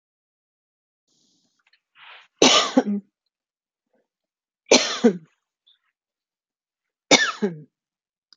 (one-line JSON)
{"three_cough_length": "8.4 s", "three_cough_amplitude": 31875, "three_cough_signal_mean_std_ratio": 0.26, "survey_phase": "beta (2021-08-13 to 2022-03-07)", "age": "45-64", "gender": "Female", "wearing_mask": "No", "symptom_none": true, "smoker_status": "Never smoked", "respiratory_condition_asthma": false, "respiratory_condition_other": false, "recruitment_source": "REACT", "submission_delay": "1 day", "covid_test_result": "Negative", "covid_test_method": "RT-qPCR", "influenza_a_test_result": "Negative", "influenza_b_test_result": "Negative"}